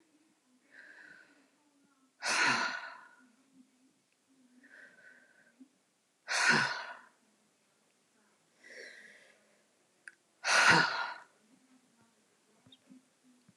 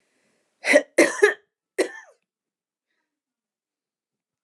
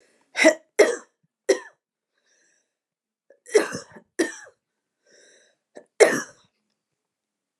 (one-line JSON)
{"exhalation_length": "13.6 s", "exhalation_amplitude": 9116, "exhalation_signal_mean_std_ratio": 0.3, "cough_length": "4.4 s", "cough_amplitude": 25751, "cough_signal_mean_std_ratio": 0.25, "three_cough_length": "7.6 s", "three_cough_amplitude": 28484, "three_cough_signal_mean_std_ratio": 0.25, "survey_phase": "beta (2021-08-13 to 2022-03-07)", "age": "45-64", "gender": "Female", "wearing_mask": "No", "symptom_none": true, "smoker_status": "Never smoked", "respiratory_condition_asthma": false, "respiratory_condition_other": false, "recruitment_source": "REACT", "submission_delay": "3 days", "covid_test_result": "Negative", "covid_test_method": "RT-qPCR", "influenza_a_test_result": "Negative", "influenza_b_test_result": "Negative"}